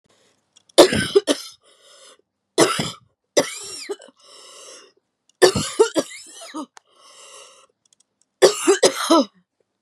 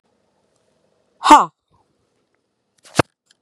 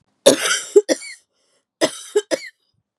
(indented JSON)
{
  "three_cough_length": "9.8 s",
  "three_cough_amplitude": 32768,
  "three_cough_signal_mean_std_ratio": 0.34,
  "exhalation_length": "3.4 s",
  "exhalation_amplitude": 32768,
  "exhalation_signal_mean_std_ratio": 0.19,
  "cough_length": "3.0 s",
  "cough_amplitude": 32768,
  "cough_signal_mean_std_ratio": 0.35,
  "survey_phase": "beta (2021-08-13 to 2022-03-07)",
  "age": "45-64",
  "gender": "Female",
  "wearing_mask": "No",
  "symptom_shortness_of_breath": true,
  "symptom_sore_throat": true,
  "symptom_diarrhoea": true,
  "symptom_fatigue": true,
  "symptom_headache": true,
  "symptom_other": true,
  "symptom_onset": "3 days",
  "smoker_status": "Never smoked",
  "respiratory_condition_asthma": true,
  "respiratory_condition_other": false,
  "recruitment_source": "Test and Trace",
  "submission_delay": "2 days",
  "covid_test_result": "Positive",
  "covid_test_method": "RT-qPCR",
  "covid_ct_value": 14.5,
  "covid_ct_gene": "ORF1ab gene"
}